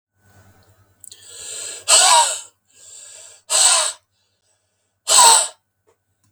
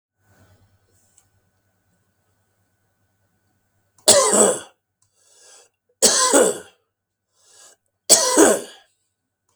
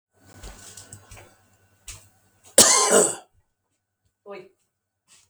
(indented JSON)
{
  "exhalation_length": "6.3 s",
  "exhalation_amplitude": 32768,
  "exhalation_signal_mean_std_ratio": 0.38,
  "three_cough_length": "9.6 s",
  "three_cough_amplitude": 32768,
  "three_cough_signal_mean_std_ratio": 0.31,
  "cough_length": "5.3 s",
  "cough_amplitude": 32768,
  "cough_signal_mean_std_ratio": 0.27,
  "survey_phase": "beta (2021-08-13 to 2022-03-07)",
  "age": "65+",
  "gender": "Male",
  "wearing_mask": "No",
  "symptom_cough_any": true,
  "symptom_runny_or_blocked_nose": true,
  "symptom_fever_high_temperature": true,
  "symptom_headache": true,
  "smoker_status": "Never smoked",
  "respiratory_condition_asthma": false,
  "respiratory_condition_other": false,
  "recruitment_source": "Test and Trace",
  "submission_delay": "2 days",
  "covid_test_result": "Positive",
  "covid_test_method": "RT-qPCR"
}